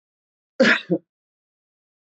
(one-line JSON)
{"cough_length": "2.1 s", "cough_amplitude": 18985, "cough_signal_mean_std_ratio": 0.28, "survey_phase": "beta (2021-08-13 to 2022-03-07)", "age": "45-64", "gender": "Male", "wearing_mask": "No", "symptom_none": true, "smoker_status": "Never smoked", "respiratory_condition_asthma": false, "respiratory_condition_other": false, "recruitment_source": "Test and Trace", "submission_delay": "0 days", "covid_test_result": "Negative", "covid_test_method": "LFT"}